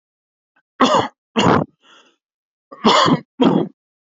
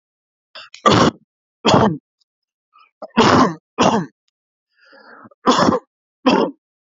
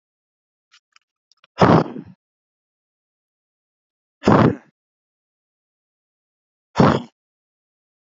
cough_length: 4.1 s
cough_amplitude: 28624
cough_signal_mean_std_ratio: 0.43
three_cough_length: 6.8 s
three_cough_amplitude: 32768
three_cough_signal_mean_std_ratio: 0.41
exhalation_length: 8.1 s
exhalation_amplitude: 27963
exhalation_signal_mean_std_ratio: 0.24
survey_phase: beta (2021-08-13 to 2022-03-07)
age: 45-64
gender: Male
wearing_mask: 'No'
symptom_none: true
symptom_onset: 7 days
smoker_status: Never smoked
respiratory_condition_asthma: false
respiratory_condition_other: false
recruitment_source: REACT
submission_delay: 0 days
covid_test_result: Negative
covid_test_method: RT-qPCR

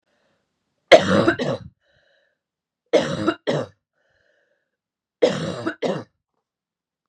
three_cough_length: 7.1 s
three_cough_amplitude: 32768
three_cough_signal_mean_std_ratio: 0.32
survey_phase: beta (2021-08-13 to 2022-03-07)
age: 45-64
gender: Female
wearing_mask: 'No'
symptom_shortness_of_breath: true
symptom_sore_throat: true
symptom_fatigue: true
symptom_headache: true
smoker_status: Never smoked
respiratory_condition_asthma: false
respiratory_condition_other: false
recruitment_source: Test and Trace
submission_delay: 2 days
covid_test_result: Positive
covid_test_method: RT-qPCR
covid_ct_value: 20.2
covid_ct_gene: ORF1ab gene
covid_ct_mean: 20.7
covid_viral_load: 160000 copies/ml
covid_viral_load_category: Low viral load (10K-1M copies/ml)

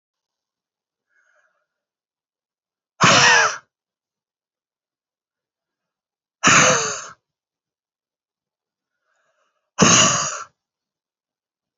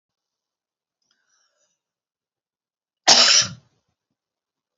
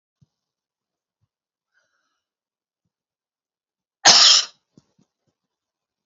exhalation_length: 11.8 s
exhalation_amplitude: 30831
exhalation_signal_mean_std_ratio: 0.29
three_cough_length: 4.8 s
three_cough_amplitude: 32768
three_cough_signal_mean_std_ratio: 0.22
cough_length: 6.1 s
cough_amplitude: 32767
cough_signal_mean_std_ratio: 0.2
survey_phase: beta (2021-08-13 to 2022-03-07)
age: 65+
gender: Female
wearing_mask: 'No'
symptom_none: true
smoker_status: Never smoked
respiratory_condition_asthma: false
respiratory_condition_other: false
recruitment_source: REACT
submission_delay: 2 days
covid_test_result: Negative
covid_test_method: RT-qPCR
influenza_a_test_result: Unknown/Void
influenza_b_test_result: Unknown/Void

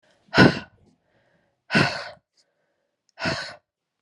exhalation_length: 4.0 s
exhalation_amplitude: 27148
exhalation_signal_mean_std_ratio: 0.29
survey_phase: alpha (2021-03-01 to 2021-08-12)
age: 18-44
gender: Female
wearing_mask: 'No'
symptom_cough_any: true
symptom_fatigue: true
symptom_change_to_sense_of_smell_or_taste: true
symptom_loss_of_taste: true
symptom_onset: 4 days
smoker_status: Never smoked
respiratory_condition_asthma: false
respiratory_condition_other: false
recruitment_source: Test and Trace
submission_delay: 1 day
covid_test_result: Positive
covid_test_method: RT-qPCR
covid_ct_value: 14.6
covid_ct_gene: N gene
covid_ct_mean: 14.9
covid_viral_load: 13000000 copies/ml
covid_viral_load_category: High viral load (>1M copies/ml)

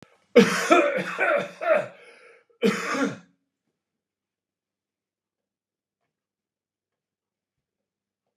cough_length: 8.4 s
cough_amplitude: 24976
cough_signal_mean_std_ratio: 0.33
survey_phase: beta (2021-08-13 to 2022-03-07)
age: 65+
gender: Male
wearing_mask: 'No'
symptom_none: true
smoker_status: Ex-smoker
respiratory_condition_asthma: false
respiratory_condition_other: false
recruitment_source: REACT
submission_delay: 1 day
covid_test_result: Negative
covid_test_method: RT-qPCR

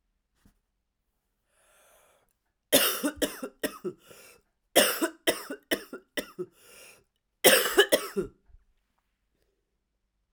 cough_length: 10.3 s
cough_amplitude: 22761
cough_signal_mean_std_ratio: 0.3
survey_phase: alpha (2021-03-01 to 2021-08-12)
age: 18-44
gender: Female
wearing_mask: 'No'
symptom_cough_any: true
symptom_diarrhoea: true
symptom_fatigue: true
symptom_headache: true
symptom_change_to_sense_of_smell_or_taste: true
smoker_status: Never smoked
respiratory_condition_asthma: true
respiratory_condition_other: false
recruitment_source: Test and Trace
submission_delay: 2 days
covid_test_result: Positive
covid_test_method: RT-qPCR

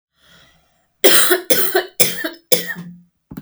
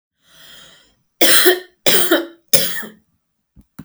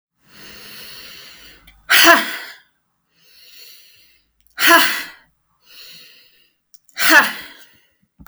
cough_length: 3.4 s
cough_amplitude: 32768
cough_signal_mean_std_ratio: 0.44
three_cough_length: 3.8 s
three_cough_amplitude: 32768
three_cough_signal_mean_std_ratio: 0.41
exhalation_length: 8.3 s
exhalation_amplitude: 32768
exhalation_signal_mean_std_ratio: 0.32
survey_phase: alpha (2021-03-01 to 2021-08-12)
age: 45-64
gender: Female
wearing_mask: 'No'
symptom_fatigue: true
symptom_onset: 13 days
smoker_status: Ex-smoker
respiratory_condition_asthma: true
respiratory_condition_other: false
recruitment_source: REACT
submission_delay: 1 day
covid_test_result: Negative
covid_test_method: RT-qPCR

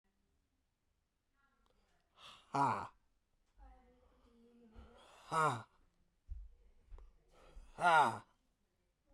exhalation_length: 9.1 s
exhalation_amplitude: 4113
exhalation_signal_mean_std_ratio: 0.28
survey_phase: beta (2021-08-13 to 2022-03-07)
age: 45-64
gender: Male
wearing_mask: 'No'
symptom_cough_any: true
symptom_new_continuous_cough: true
symptom_runny_or_blocked_nose: true
symptom_shortness_of_breath: true
symptom_sore_throat: true
symptom_diarrhoea: true
symptom_fatigue: true
symptom_headache: true
symptom_onset: 3 days
smoker_status: Ex-smoker
respiratory_condition_asthma: false
respiratory_condition_other: false
recruitment_source: Test and Trace
submission_delay: 1 day
covid_test_result: Positive
covid_test_method: RT-qPCR
covid_ct_value: 15.2
covid_ct_gene: ORF1ab gene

